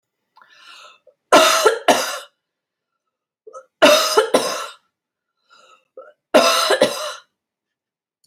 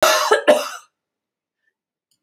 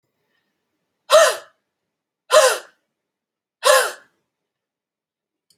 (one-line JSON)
{"three_cough_length": "8.3 s", "three_cough_amplitude": 29955, "three_cough_signal_mean_std_ratio": 0.39, "cough_length": "2.2 s", "cough_amplitude": 28461, "cough_signal_mean_std_ratio": 0.4, "exhalation_length": "5.6 s", "exhalation_amplitude": 32767, "exhalation_signal_mean_std_ratio": 0.29, "survey_phase": "alpha (2021-03-01 to 2021-08-12)", "age": "65+", "gender": "Female", "wearing_mask": "No", "symptom_none": true, "smoker_status": "Ex-smoker", "respiratory_condition_asthma": false, "respiratory_condition_other": false, "recruitment_source": "REACT", "submission_delay": "2 days", "covid_test_result": "Negative", "covid_test_method": "RT-qPCR"}